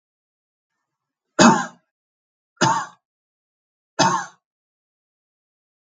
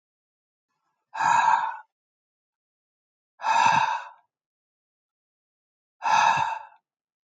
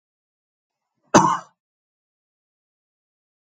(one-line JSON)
{"three_cough_length": "5.8 s", "three_cough_amplitude": 32768, "three_cough_signal_mean_std_ratio": 0.26, "exhalation_length": "7.3 s", "exhalation_amplitude": 13148, "exhalation_signal_mean_std_ratio": 0.4, "cough_length": "3.4 s", "cough_amplitude": 32768, "cough_signal_mean_std_ratio": 0.19, "survey_phase": "beta (2021-08-13 to 2022-03-07)", "age": "45-64", "gender": "Male", "wearing_mask": "No", "symptom_runny_or_blocked_nose": true, "smoker_status": "Never smoked", "respiratory_condition_asthma": false, "respiratory_condition_other": false, "recruitment_source": "REACT", "submission_delay": "4 days", "covid_test_result": "Negative", "covid_test_method": "RT-qPCR", "influenza_a_test_result": "Negative", "influenza_b_test_result": "Negative"}